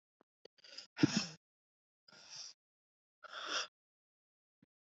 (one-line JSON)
{"exhalation_length": "4.9 s", "exhalation_amplitude": 5745, "exhalation_signal_mean_std_ratio": 0.24, "survey_phase": "beta (2021-08-13 to 2022-03-07)", "age": "18-44", "gender": "Female", "wearing_mask": "No", "symptom_cough_any": true, "symptom_runny_or_blocked_nose": true, "symptom_sore_throat": true, "symptom_headache": true, "symptom_onset": "2 days", "smoker_status": "Ex-smoker", "respiratory_condition_asthma": false, "respiratory_condition_other": false, "recruitment_source": "Test and Trace", "submission_delay": "2 days", "covid_test_result": "Positive", "covid_test_method": "RT-qPCR", "covid_ct_value": 18.2, "covid_ct_gene": "ORF1ab gene", "covid_ct_mean": 18.4, "covid_viral_load": "940000 copies/ml", "covid_viral_load_category": "Low viral load (10K-1M copies/ml)"}